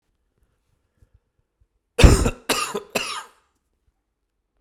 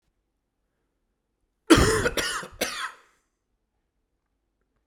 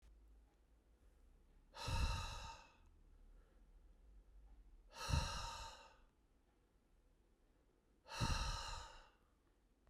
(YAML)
three_cough_length: 4.6 s
three_cough_amplitude: 32768
three_cough_signal_mean_std_ratio: 0.25
cough_length: 4.9 s
cough_amplitude: 28073
cough_signal_mean_std_ratio: 0.29
exhalation_length: 9.9 s
exhalation_amplitude: 1858
exhalation_signal_mean_std_ratio: 0.43
survey_phase: beta (2021-08-13 to 2022-03-07)
age: 45-64
gender: Male
wearing_mask: 'No'
symptom_cough_any: true
symptom_runny_or_blocked_nose: true
symptom_fatigue: true
symptom_fever_high_temperature: true
symptom_headache: true
symptom_change_to_sense_of_smell_or_taste: true
symptom_onset: 3 days
smoker_status: Never smoked
respiratory_condition_asthma: false
respiratory_condition_other: false
recruitment_source: Test and Trace
submission_delay: 2 days
covid_test_result: Positive
covid_test_method: RT-qPCR